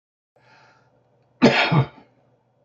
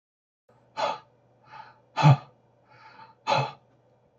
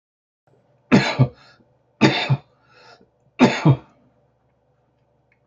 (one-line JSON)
{"cough_length": "2.6 s", "cough_amplitude": 26940, "cough_signal_mean_std_ratio": 0.32, "exhalation_length": "4.2 s", "exhalation_amplitude": 15862, "exhalation_signal_mean_std_ratio": 0.28, "three_cough_length": "5.5 s", "three_cough_amplitude": 27986, "three_cough_signal_mean_std_ratio": 0.32, "survey_phase": "beta (2021-08-13 to 2022-03-07)", "age": "45-64", "gender": "Male", "wearing_mask": "No", "symptom_runny_or_blocked_nose": true, "symptom_shortness_of_breath": true, "symptom_diarrhoea": true, "symptom_onset": "10 days", "smoker_status": "Ex-smoker", "respiratory_condition_asthma": false, "respiratory_condition_other": true, "recruitment_source": "REACT", "submission_delay": "3 days", "covid_test_result": "Negative", "covid_test_method": "RT-qPCR", "influenza_a_test_result": "Unknown/Void", "influenza_b_test_result": "Unknown/Void"}